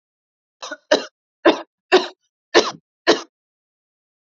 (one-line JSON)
{"cough_length": "4.3 s", "cough_amplitude": 29330, "cough_signal_mean_std_ratio": 0.28, "survey_phase": "beta (2021-08-13 to 2022-03-07)", "age": "18-44", "gender": "Female", "wearing_mask": "No", "symptom_none": true, "smoker_status": "Never smoked", "respiratory_condition_asthma": false, "respiratory_condition_other": false, "recruitment_source": "REACT", "submission_delay": "2 days", "covid_test_result": "Negative", "covid_test_method": "RT-qPCR", "influenza_a_test_result": "Negative", "influenza_b_test_result": "Negative"}